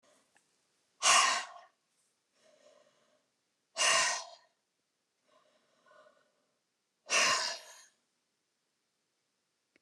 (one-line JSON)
{"exhalation_length": "9.8 s", "exhalation_amplitude": 8505, "exhalation_signal_mean_std_ratio": 0.29, "survey_phase": "beta (2021-08-13 to 2022-03-07)", "age": "65+", "gender": "Female", "wearing_mask": "No", "symptom_abdominal_pain": true, "symptom_onset": "11 days", "smoker_status": "Never smoked", "respiratory_condition_asthma": true, "respiratory_condition_other": true, "recruitment_source": "REACT", "submission_delay": "2 days", "covid_test_result": "Negative", "covid_test_method": "RT-qPCR", "influenza_a_test_result": "Negative", "influenza_b_test_result": "Negative"}